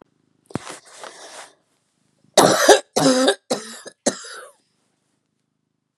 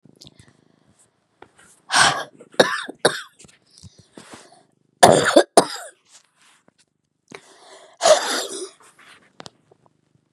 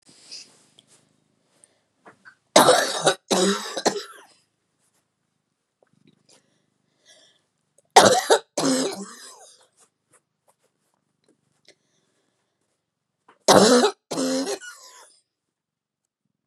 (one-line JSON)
{"cough_length": "6.0 s", "cough_amplitude": 32768, "cough_signal_mean_std_ratio": 0.33, "exhalation_length": "10.3 s", "exhalation_amplitude": 32768, "exhalation_signal_mean_std_ratio": 0.28, "three_cough_length": "16.5 s", "three_cough_amplitude": 32767, "three_cough_signal_mean_std_ratio": 0.29, "survey_phase": "beta (2021-08-13 to 2022-03-07)", "age": "45-64", "gender": "Female", "wearing_mask": "No", "symptom_cough_any": true, "symptom_runny_or_blocked_nose": true, "symptom_fatigue": true, "symptom_headache": true, "smoker_status": "Ex-smoker", "respiratory_condition_asthma": false, "respiratory_condition_other": false, "recruitment_source": "Test and Trace", "submission_delay": "2 days", "covid_test_result": "Positive", "covid_test_method": "RT-qPCR", "covid_ct_value": 28.2, "covid_ct_gene": "ORF1ab gene"}